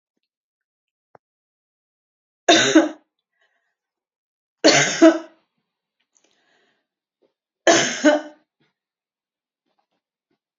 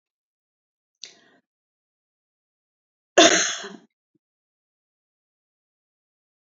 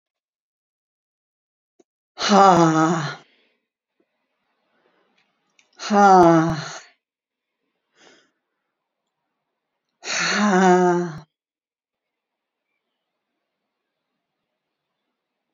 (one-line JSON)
{"three_cough_length": "10.6 s", "three_cough_amplitude": 28203, "three_cough_signal_mean_std_ratio": 0.26, "cough_length": "6.5 s", "cough_amplitude": 28689, "cough_signal_mean_std_ratio": 0.17, "exhalation_length": "15.5 s", "exhalation_amplitude": 32767, "exhalation_signal_mean_std_ratio": 0.31, "survey_phase": "alpha (2021-03-01 to 2021-08-12)", "age": "65+", "gender": "Female", "wearing_mask": "No", "symptom_none": true, "smoker_status": "Never smoked", "respiratory_condition_asthma": false, "respiratory_condition_other": false, "recruitment_source": "REACT", "submission_delay": "2 days", "covid_test_result": "Negative", "covid_test_method": "RT-qPCR"}